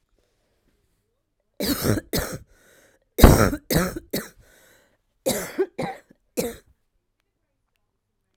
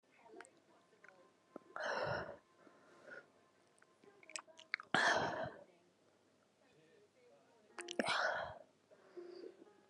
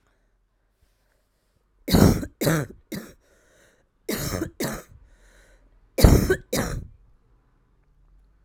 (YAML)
cough_length: 8.4 s
cough_amplitude: 32768
cough_signal_mean_std_ratio: 0.29
exhalation_length: 9.9 s
exhalation_amplitude: 4784
exhalation_signal_mean_std_ratio: 0.38
three_cough_length: 8.4 s
three_cough_amplitude: 32768
three_cough_signal_mean_std_ratio: 0.32
survey_phase: alpha (2021-03-01 to 2021-08-12)
age: 18-44
gender: Female
wearing_mask: 'No'
symptom_cough_any: true
symptom_shortness_of_breath: true
symptom_abdominal_pain: true
symptom_diarrhoea: true
symptom_fatigue: true
symptom_fever_high_temperature: true
symptom_headache: true
symptom_change_to_sense_of_smell_or_taste: true
symptom_loss_of_taste: true
symptom_onset: 4 days
smoker_status: Current smoker (11 or more cigarettes per day)
recruitment_source: Test and Trace
submission_delay: 2 days
covid_test_result: Positive
covid_test_method: RT-qPCR
covid_ct_value: 15.4
covid_ct_gene: ORF1ab gene
covid_ct_mean: 16.3
covid_viral_load: 4500000 copies/ml
covid_viral_load_category: High viral load (>1M copies/ml)